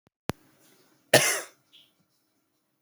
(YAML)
cough_length: 2.8 s
cough_amplitude: 23826
cough_signal_mean_std_ratio: 0.22
survey_phase: beta (2021-08-13 to 2022-03-07)
age: 18-44
gender: Male
wearing_mask: 'No'
symptom_cough_any: true
symptom_shortness_of_breath: true
symptom_fatigue: true
symptom_change_to_sense_of_smell_or_taste: true
symptom_loss_of_taste: true
symptom_onset: 4 days
smoker_status: Never smoked
respiratory_condition_asthma: false
respiratory_condition_other: false
recruitment_source: Test and Trace
submission_delay: 2 days
covid_test_result: Positive
covid_test_method: RT-qPCR
covid_ct_value: 17.9
covid_ct_gene: ORF1ab gene
covid_ct_mean: 18.4
covid_viral_load: 960000 copies/ml
covid_viral_load_category: Low viral load (10K-1M copies/ml)